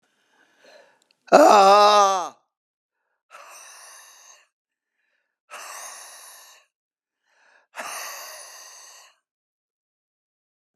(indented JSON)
{
  "exhalation_length": "10.8 s",
  "exhalation_amplitude": 31845,
  "exhalation_signal_mean_std_ratio": 0.26,
  "survey_phase": "beta (2021-08-13 to 2022-03-07)",
  "age": "65+",
  "gender": "Male",
  "wearing_mask": "No",
  "symptom_none": true,
  "smoker_status": "Ex-smoker",
  "respiratory_condition_asthma": true,
  "respiratory_condition_other": false,
  "recruitment_source": "REACT",
  "submission_delay": "2 days",
  "covid_test_result": "Negative",
  "covid_test_method": "RT-qPCR"
}